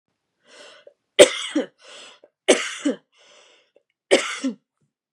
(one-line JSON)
{"three_cough_length": "5.1 s", "three_cough_amplitude": 32768, "three_cough_signal_mean_std_ratio": 0.27, "survey_phase": "beta (2021-08-13 to 2022-03-07)", "age": "18-44", "gender": "Female", "wearing_mask": "No", "symptom_sore_throat": true, "symptom_onset": "6 days", "smoker_status": "Never smoked", "respiratory_condition_asthma": false, "respiratory_condition_other": false, "recruitment_source": "REACT", "submission_delay": "1 day", "covid_test_result": "Negative", "covid_test_method": "RT-qPCR", "influenza_a_test_result": "Unknown/Void", "influenza_b_test_result": "Unknown/Void"}